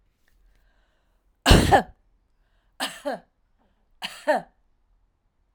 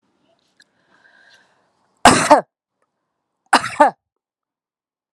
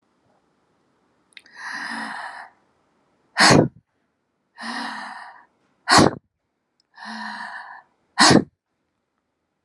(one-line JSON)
{"three_cough_length": "5.5 s", "three_cough_amplitude": 28832, "three_cough_signal_mean_std_ratio": 0.26, "cough_length": "5.1 s", "cough_amplitude": 32768, "cough_signal_mean_std_ratio": 0.24, "exhalation_length": "9.6 s", "exhalation_amplitude": 29981, "exhalation_signal_mean_std_ratio": 0.29, "survey_phase": "alpha (2021-03-01 to 2021-08-12)", "age": "45-64", "gender": "Female", "wearing_mask": "No", "symptom_none": true, "smoker_status": "Never smoked", "respiratory_condition_asthma": false, "respiratory_condition_other": false, "recruitment_source": "REACT", "submission_delay": "2 days", "covid_test_result": "Negative", "covid_test_method": "RT-qPCR"}